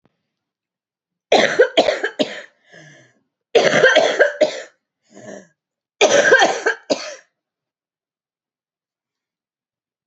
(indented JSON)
{
  "cough_length": "10.1 s",
  "cough_amplitude": 29377,
  "cough_signal_mean_std_ratio": 0.38,
  "survey_phase": "beta (2021-08-13 to 2022-03-07)",
  "age": "45-64",
  "gender": "Female",
  "wearing_mask": "No",
  "symptom_cough_any": true,
  "symptom_diarrhoea": true,
  "symptom_fatigue": true,
  "symptom_fever_high_temperature": true,
  "symptom_headache": true,
  "symptom_onset": "4 days",
  "smoker_status": "Never smoked",
  "respiratory_condition_asthma": false,
  "respiratory_condition_other": false,
  "recruitment_source": "Test and Trace",
  "submission_delay": "1 day",
  "covid_test_result": "Positive",
  "covid_test_method": "RT-qPCR",
  "covid_ct_value": 16.4,
  "covid_ct_gene": "ORF1ab gene"
}